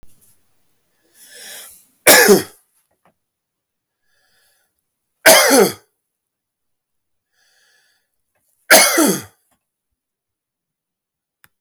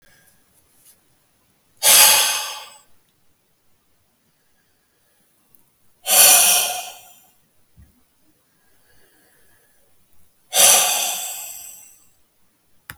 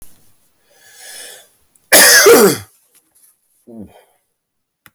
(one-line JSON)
{"three_cough_length": "11.6 s", "three_cough_amplitude": 32768, "three_cough_signal_mean_std_ratio": 0.27, "exhalation_length": "13.0 s", "exhalation_amplitude": 32768, "exhalation_signal_mean_std_ratio": 0.32, "cough_length": "4.9 s", "cough_amplitude": 32768, "cough_signal_mean_std_ratio": 0.34, "survey_phase": "alpha (2021-03-01 to 2021-08-12)", "age": "45-64", "gender": "Male", "wearing_mask": "No", "symptom_cough_any": true, "symptom_new_continuous_cough": true, "symptom_abdominal_pain": true, "symptom_fatigue": true, "symptom_fever_high_temperature": true, "symptom_headache": true, "symptom_onset": "4 days", "smoker_status": "Ex-smoker", "respiratory_condition_asthma": false, "respiratory_condition_other": false, "recruitment_source": "Test and Trace", "submission_delay": "2 days", "covid_test_result": "Positive", "covid_test_method": "RT-qPCR", "covid_ct_value": 12.7, "covid_ct_gene": "ORF1ab gene", "covid_ct_mean": 13.5, "covid_viral_load": "38000000 copies/ml", "covid_viral_load_category": "High viral load (>1M copies/ml)"}